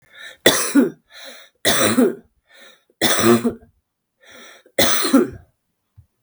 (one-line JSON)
{"three_cough_length": "6.2 s", "three_cough_amplitude": 32768, "three_cough_signal_mean_std_ratio": 0.47, "survey_phase": "beta (2021-08-13 to 2022-03-07)", "age": "45-64", "gender": "Female", "wearing_mask": "No", "symptom_cough_any": true, "symptom_shortness_of_breath": true, "symptom_abdominal_pain": true, "symptom_headache": true, "symptom_change_to_sense_of_smell_or_taste": true, "smoker_status": "Ex-smoker", "respiratory_condition_asthma": true, "respiratory_condition_other": true, "recruitment_source": "Test and Trace", "submission_delay": "1 day", "covid_test_result": "Positive", "covid_test_method": "RT-qPCR", "covid_ct_value": 21.1, "covid_ct_gene": "ORF1ab gene", "covid_ct_mean": 21.5, "covid_viral_load": "90000 copies/ml", "covid_viral_load_category": "Low viral load (10K-1M copies/ml)"}